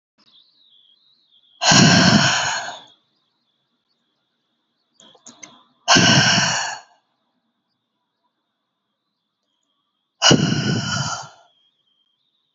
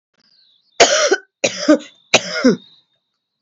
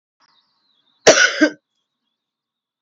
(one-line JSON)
{"exhalation_length": "12.5 s", "exhalation_amplitude": 31374, "exhalation_signal_mean_std_ratio": 0.37, "three_cough_length": "3.4 s", "three_cough_amplitude": 32768, "three_cough_signal_mean_std_ratio": 0.4, "cough_length": "2.8 s", "cough_amplitude": 32768, "cough_signal_mean_std_ratio": 0.27, "survey_phase": "beta (2021-08-13 to 2022-03-07)", "age": "45-64", "gender": "Female", "wearing_mask": "No", "symptom_none": true, "smoker_status": "Never smoked", "respiratory_condition_asthma": false, "respiratory_condition_other": false, "recruitment_source": "REACT", "submission_delay": "5 days", "covid_test_result": "Negative", "covid_test_method": "RT-qPCR", "influenza_a_test_result": "Negative", "influenza_b_test_result": "Negative"}